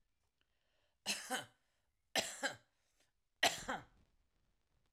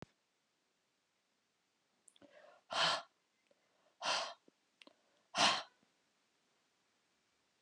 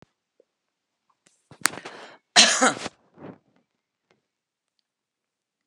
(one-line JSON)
{"three_cough_length": "4.9 s", "three_cough_amplitude": 4381, "three_cough_signal_mean_std_ratio": 0.3, "exhalation_length": "7.6 s", "exhalation_amplitude": 4574, "exhalation_signal_mean_std_ratio": 0.26, "cough_length": "5.7 s", "cough_amplitude": 32768, "cough_signal_mean_std_ratio": 0.21, "survey_phase": "alpha (2021-03-01 to 2021-08-12)", "age": "65+", "gender": "Female", "wearing_mask": "No", "symptom_cough_any": true, "symptom_fatigue": true, "symptom_onset": "8 days", "smoker_status": "Never smoked", "respiratory_condition_asthma": false, "respiratory_condition_other": false, "recruitment_source": "REACT", "submission_delay": "1 day", "covid_test_result": "Negative", "covid_test_method": "RT-qPCR"}